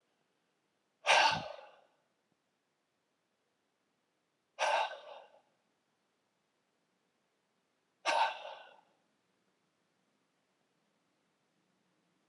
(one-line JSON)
{"exhalation_length": "12.3 s", "exhalation_amplitude": 7996, "exhalation_signal_mean_std_ratio": 0.24, "survey_phase": "alpha (2021-03-01 to 2021-08-12)", "age": "45-64", "gender": "Male", "wearing_mask": "No", "symptom_cough_any": true, "symptom_diarrhoea": true, "symptom_onset": "5 days", "smoker_status": "Never smoked", "respiratory_condition_asthma": true, "respiratory_condition_other": false, "recruitment_source": "Test and Trace", "submission_delay": "2 days", "covid_test_result": "Positive", "covid_test_method": "RT-qPCR"}